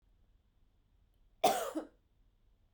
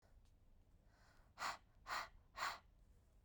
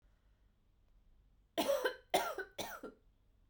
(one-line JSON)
{"cough_length": "2.7 s", "cough_amplitude": 6005, "cough_signal_mean_std_ratio": 0.27, "exhalation_length": "3.2 s", "exhalation_amplitude": 883, "exhalation_signal_mean_std_ratio": 0.44, "three_cough_length": "3.5 s", "three_cough_amplitude": 3600, "three_cough_signal_mean_std_ratio": 0.39, "survey_phase": "beta (2021-08-13 to 2022-03-07)", "age": "18-44", "gender": "Female", "wearing_mask": "No", "symptom_cough_any": true, "symptom_runny_or_blocked_nose": true, "symptom_shortness_of_breath": true, "symptom_fatigue": true, "symptom_fever_high_temperature": true, "symptom_headache": true, "symptom_change_to_sense_of_smell_or_taste": true, "symptom_onset": "6 days", "smoker_status": "Never smoked", "respiratory_condition_asthma": true, "respiratory_condition_other": false, "recruitment_source": "Test and Trace", "submission_delay": "1 day", "covid_test_result": "Positive", "covid_test_method": "RT-qPCR", "covid_ct_value": 16.4, "covid_ct_gene": "ORF1ab gene", "covid_ct_mean": 16.9, "covid_viral_load": "2900000 copies/ml", "covid_viral_load_category": "High viral load (>1M copies/ml)"}